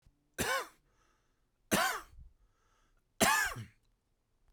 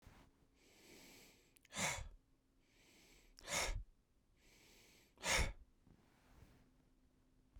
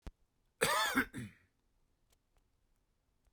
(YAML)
three_cough_length: 4.5 s
three_cough_amplitude: 7750
three_cough_signal_mean_std_ratio: 0.36
exhalation_length: 7.6 s
exhalation_amplitude: 2095
exhalation_signal_mean_std_ratio: 0.35
cough_length: 3.3 s
cough_amplitude: 6121
cough_signal_mean_std_ratio: 0.33
survey_phase: beta (2021-08-13 to 2022-03-07)
age: 18-44
gender: Male
wearing_mask: 'No'
symptom_abdominal_pain: true
symptom_fatigue: true
symptom_headache: true
smoker_status: Ex-smoker
respiratory_condition_asthma: false
respiratory_condition_other: false
recruitment_source: REACT
submission_delay: 0 days
covid_test_result: Negative
covid_test_method: RT-qPCR